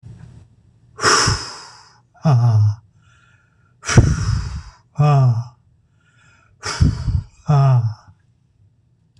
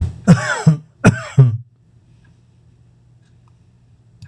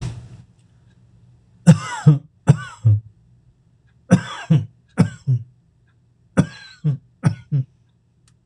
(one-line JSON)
{"exhalation_length": "9.2 s", "exhalation_amplitude": 26028, "exhalation_signal_mean_std_ratio": 0.5, "cough_length": "4.3 s", "cough_amplitude": 26028, "cough_signal_mean_std_ratio": 0.35, "three_cough_length": "8.5 s", "three_cough_amplitude": 26028, "three_cough_signal_mean_std_ratio": 0.34, "survey_phase": "beta (2021-08-13 to 2022-03-07)", "age": "65+", "gender": "Male", "wearing_mask": "No", "symptom_none": true, "smoker_status": "Never smoked", "respiratory_condition_asthma": false, "respiratory_condition_other": false, "recruitment_source": "REACT", "submission_delay": "4 days", "covid_test_result": "Negative", "covid_test_method": "RT-qPCR"}